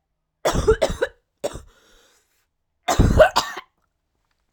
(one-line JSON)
{"cough_length": "4.5 s", "cough_amplitude": 32767, "cough_signal_mean_std_ratio": 0.36, "survey_phase": "alpha (2021-03-01 to 2021-08-12)", "age": "18-44", "gender": "Female", "wearing_mask": "No", "symptom_cough_any": true, "symptom_shortness_of_breath": true, "symptom_abdominal_pain": true, "symptom_fatigue": true, "symptom_fever_high_temperature": true, "symptom_headache": true, "symptom_change_to_sense_of_smell_or_taste": true, "symptom_loss_of_taste": true, "symptom_onset": "2 days", "smoker_status": "Current smoker (1 to 10 cigarettes per day)", "respiratory_condition_asthma": false, "respiratory_condition_other": false, "recruitment_source": "Test and Trace", "submission_delay": "1 day", "covid_test_result": "Positive", "covid_test_method": "RT-qPCR"}